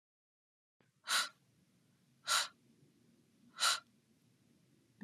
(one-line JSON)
{"exhalation_length": "5.0 s", "exhalation_amplitude": 4541, "exhalation_signal_mean_std_ratio": 0.28, "survey_phase": "beta (2021-08-13 to 2022-03-07)", "age": "45-64", "gender": "Female", "wearing_mask": "No", "symptom_cough_any": true, "smoker_status": "Never smoked", "respiratory_condition_asthma": false, "respiratory_condition_other": false, "recruitment_source": "REACT", "submission_delay": "2 days", "covid_test_result": "Negative", "covid_test_method": "RT-qPCR"}